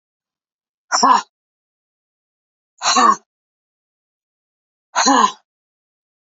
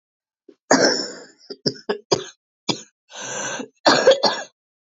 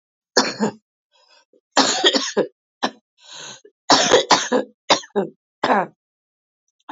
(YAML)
exhalation_length: 6.2 s
exhalation_amplitude: 29966
exhalation_signal_mean_std_ratio: 0.31
cough_length: 4.9 s
cough_amplitude: 28016
cough_signal_mean_std_ratio: 0.41
three_cough_length: 6.9 s
three_cough_amplitude: 32767
three_cough_signal_mean_std_ratio: 0.41
survey_phase: beta (2021-08-13 to 2022-03-07)
age: 45-64
gender: Female
wearing_mask: 'No'
symptom_cough_any: true
symptom_runny_or_blocked_nose: true
symptom_shortness_of_breath: true
symptom_sore_throat: true
symptom_fatigue: true
symptom_fever_high_temperature: true
symptom_headache: true
symptom_onset: 2 days
smoker_status: Never smoked
respiratory_condition_asthma: true
respiratory_condition_other: false
recruitment_source: Test and Trace
submission_delay: 1 day
covid_test_result: Positive
covid_test_method: RT-qPCR
covid_ct_value: 18.2
covid_ct_gene: ORF1ab gene
covid_ct_mean: 18.7
covid_viral_load: 760000 copies/ml
covid_viral_load_category: Low viral load (10K-1M copies/ml)